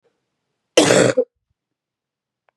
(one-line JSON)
{"cough_length": "2.6 s", "cough_amplitude": 32768, "cough_signal_mean_std_ratio": 0.32, "survey_phase": "beta (2021-08-13 to 2022-03-07)", "age": "18-44", "gender": "Female", "wearing_mask": "No", "symptom_cough_any": true, "symptom_runny_or_blocked_nose": true, "symptom_fatigue": true, "symptom_fever_high_temperature": true, "symptom_headache": true, "symptom_change_to_sense_of_smell_or_taste": true, "symptom_loss_of_taste": true, "symptom_onset": "5 days", "smoker_status": "Never smoked", "respiratory_condition_asthma": false, "respiratory_condition_other": false, "recruitment_source": "Test and Trace", "submission_delay": "1 day", "covid_test_result": "Positive", "covid_test_method": "RT-qPCR", "covid_ct_value": 13.4, "covid_ct_gene": "ORF1ab gene"}